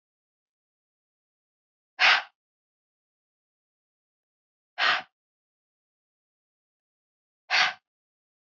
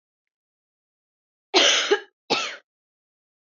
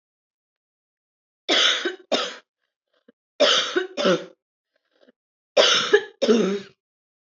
{"exhalation_length": "8.4 s", "exhalation_amplitude": 13313, "exhalation_signal_mean_std_ratio": 0.21, "cough_length": "3.6 s", "cough_amplitude": 21167, "cough_signal_mean_std_ratio": 0.32, "three_cough_length": "7.3 s", "three_cough_amplitude": 23927, "three_cough_signal_mean_std_ratio": 0.42, "survey_phase": "beta (2021-08-13 to 2022-03-07)", "age": "18-44", "gender": "Female", "wearing_mask": "No", "symptom_none": true, "symptom_onset": "7 days", "smoker_status": "Never smoked", "respiratory_condition_asthma": false, "respiratory_condition_other": false, "recruitment_source": "REACT", "submission_delay": "1 day", "covid_test_result": "Negative", "covid_test_method": "RT-qPCR"}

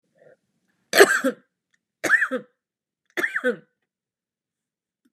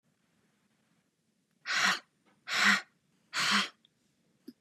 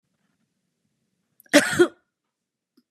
{"three_cough_length": "5.1 s", "three_cough_amplitude": 32767, "three_cough_signal_mean_std_ratio": 0.29, "exhalation_length": "4.6 s", "exhalation_amplitude": 8523, "exhalation_signal_mean_std_ratio": 0.37, "cough_length": "2.9 s", "cough_amplitude": 30310, "cough_signal_mean_std_ratio": 0.23, "survey_phase": "beta (2021-08-13 to 2022-03-07)", "age": "18-44", "gender": "Female", "wearing_mask": "No", "symptom_none": true, "smoker_status": "Ex-smoker", "respiratory_condition_asthma": false, "respiratory_condition_other": false, "recruitment_source": "REACT", "submission_delay": "1 day", "covid_test_result": "Negative", "covid_test_method": "RT-qPCR", "influenza_a_test_result": "Unknown/Void", "influenza_b_test_result": "Unknown/Void"}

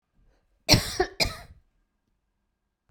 {"cough_length": "2.9 s", "cough_amplitude": 24752, "cough_signal_mean_std_ratio": 0.27, "survey_phase": "beta (2021-08-13 to 2022-03-07)", "age": "65+", "gender": "Female", "wearing_mask": "No", "symptom_none": true, "smoker_status": "Never smoked", "respiratory_condition_asthma": false, "respiratory_condition_other": false, "recruitment_source": "REACT", "submission_delay": "9 days", "covid_test_result": "Negative", "covid_test_method": "RT-qPCR"}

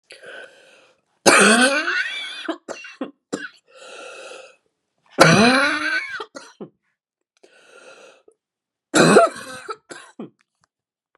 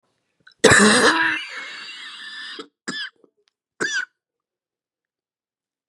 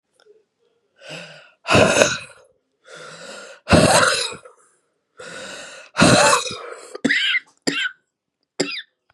{"three_cough_length": "11.2 s", "three_cough_amplitude": 32768, "three_cough_signal_mean_std_ratio": 0.38, "cough_length": "5.9 s", "cough_amplitude": 32575, "cough_signal_mean_std_ratio": 0.36, "exhalation_length": "9.1 s", "exhalation_amplitude": 32768, "exhalation_signal_mean_std_ratio": 0.43, "survey_phase": "beta (2021-08-13 to 2022-03-07)", "age": "45-64", "gender": "Female", "wearing_mask": "No", "symptom_cough_any": true, "symptom_runny_or_blocked_nose": true, "symptom_fatigue": true, "symptom_headache": true, "symptom_onset": "4 days", "smoker_status": "Ex-smoker", "respiratory_condition_asthma": false, "respiratory_condition_other": false, "recruitment_source": "Test and Trace", "submission_delay": "2 days", "covid_test_result": "Positive", "covid_test_method": "RT-qPCR", "covid_ct_value": 18.4, "covid_ct_gene": "ORF1ab gene", "covid_ct_mean": 18.6, "covid_viral_load": "780000 copies/ml", "covid_viral_load_category": "Low viral load (10K-1M copies/ml)"}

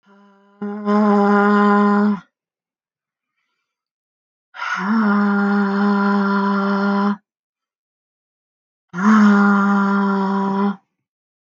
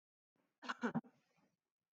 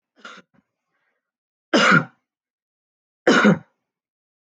{"exhalation_length": "11.4 s", "exhalation_amplitude": 24385, "exhalation_signal_mean_std_ratio": 0.67, "cough_length": "2.0 s", "cough_amplitude": 1711, "cough_signal_mean_std_ratio": 0.26, "three_cough_length": "4.5 s", "three_cough_amplitude": 22484, "three_cough_signal_mean_std_ratio": 0.3, "survey_phase": "alpha (2021-03-01 to 2021-08-12)", "age": "45-64", "gender": "Female", "wearing_mask": "No", "symptom_none": true, "smoker_status": "Ex-smoker", "respiratory_condition_asthma": false, "respiratory_condition_other": false, "recruitment_source": "REACT", "submission_delay": "6 days", "covid_test_result": "Negative", "covid_test_method": "RT-qPCR"}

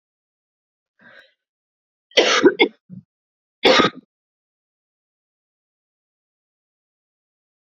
{"three_cough_length": "7.7 s", "three_cough_amplitude": 32768, "three_cough_signal_mean_std_ratio": 0.23, "survey_phase": "beta (2021-08-13 to 2022-03-07)", "age": "18-44", "gender": "Female", "wearing_mask": "No", "symptom_cough_any": true, "symptom_runny_or_blocked_nose": true, "symptom_headache": true, "smoker_status": "Never smoked", "respiratory_condition_asthma": false, "respiratory_condition_other": false, "recruitment_source": "Test and Trace", "submission_delay": "2 days", "covid_test_result": "Positive", "covid_test_method": "ePCR"}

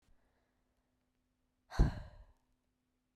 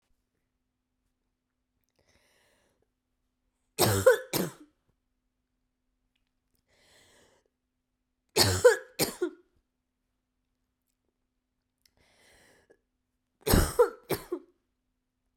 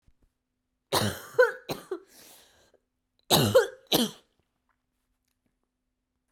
{"exhalation_length": "3.2 s", "exhalation_amplitude": 3930, "exhalation_signal_mean_std_ratio": 0.19, "three_cough_length": "15.4 s", "three_cough_amplitude": 14486, "three_cough_signal_mean_std_ratio": 0.23, "cough_length": "6.3 s", "cough_amplitude": 13428, "cough_signal_mean_std_ratio": 0.3, "survey_phase": "beta (2021-08-13 to 2022-03-07)", "age": "18-44", "gender": "Female", "wearing_mask": "No", "symptom_cough_any": true, "symptom_runny_or_blocked_nose": true, "symptom_sore_throat": true, "symptom_headache": true, "symptom_other": true, "symptom_onset": "2 days", "smoker_status": "Never smoked", "respiratory_condition_asthma": false, "respiratory_condition_other": false, "recruitment_source": "Test and Trace", "submission_delay": "1 day", "covid_test_result": "Positive", "covid_test_method": "RT-qPCR", "covid_ct_value": 21.4, "covid_ct_gene": "ORF1ab gene", "covid_ct_mean": 22.1, "covid_viral_load": "58000 copies/ml", "covid_viral_load_category": "Low viral load (10K-1M copies/ml)"}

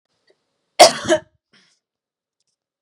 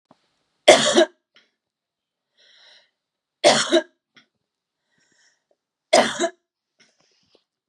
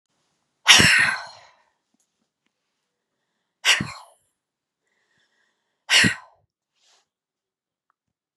{"cough_length": "2.8 s", "cough_amplitude": 32768, "cough_signal_mean_std_ratio": 0.22, "three_cough_length": "7.7 s", "three_cough_amplitude": 32768, "three_cough_signal_mean_std_ratio": 0.26, "exhalation_length": "8.4 s", "exhalation_amplitude": 32763, "exhalation_signal_mean_std_ratio": 0.26, "survey_phase": "beta (2021-08-13 to 2022-03-07)", "age": "45-64", "gender": "Female", "wearing_mask": "No", "symptom_none": true, "smoker_status": "Never smoked", "respiratory_condition_asthma": false, "respiratory_condition_other": false, "recruitment_source": "REACT", "submission_delay": "3 days", "covid_test_result": "Negative", "covid_test_method": "RT-qPCR", "influenza_a_test_result": "Unknown/Void", "influenza_b_test_result": "Unknown/Void"}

